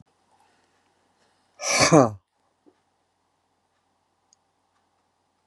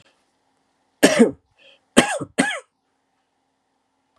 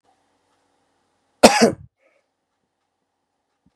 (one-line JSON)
{"exhalation_length": "5.5 s", "exhalation_amplitude": 29596, "exhalation_signal_mean_std_ratio": 0.21, "three_cough_length": "4.2 s", "three_cough_amplitude": 32768, "three_cough_signal_mean_std_ratio": 0.27, "cough_length": "3.8 s", "cough_amplitude": 32768, "cough_signal_mean_std_ratio": 0.19, "survey_phase": "beta (2021-08-13 to 2022-03-07)", "age": "65+", "gender": "Male", "wearing_mask": "No", "symptom_none": true, "smoker_status": "Never smoked", "respiratory_condition_asthma": false, "respiratory_condition_other": false, "recruitment_source": "REACT", "submission_delay": "2 days", "covid_test_result": "Negative", "covid_test_method": "RT-qPCR", "influenza_a_test_result": "Negative", "influenza_b_test_result": "Negative"}